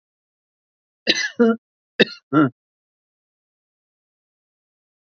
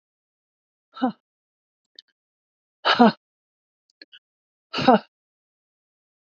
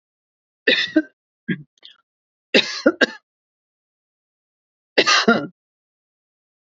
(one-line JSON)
{"cough_length": "5.1 s", "cough_amplitude": 28084, "cough_signal_mean_std_ratio": 0.25, "exhalation_length": "6.3 s", "exhalation_amplitude": 26269, "exhalation_signal_mean_std_ratio": 0.21, "three_cough_length": "6.7 s", "three_cough_amplitude": 30096, "three_cough_signal_mean_std_ratio": 0.29, "survey_phase": "beta (2021-08-13 to 2022-03-07)", "age": "65+", "gender": "Female", "wearing_mask": "No", "symptom_prefer_not_to_say": true, "smoker_status": "Never smoked", "respiratory_condition_asthma": false, "respiratory_condition_other": false, "recruitment_source": "REACT", "submission_delay": "1 day", "covid_test_result": "Negative", "covid_test_method": "RT-qPCR", "influenza_a_test_result": "Negative", "influenza_b_test_result": "Negative"}